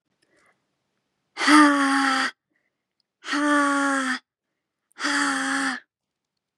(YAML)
exhalation_length: 6.6 s
exhalation_amplitude: 23497
exhalation_signal_mean_std_ratio: 0.51
survey_phase: beta (2021-08-13 to 2022-03-07)
age: 18-44
gender: Female
wearing_mask: 'No'
symptom_runny_or_blocked_nose: true
symptom_shortness_of_breath: true
symptom_fatigue: true
symptom_headache: true
symptom_onset: 3 days
smoker_status: Ex-smoker
respiratory_condition_asthma: true
respiratory_condition_other: false
recruitment_source: REACT
submission_delay: 1 day
covid_test_result: Negative
covid_test_method: RT-qPCR
influenza_a_test_result: Negative
influenza_b_test_result: Negative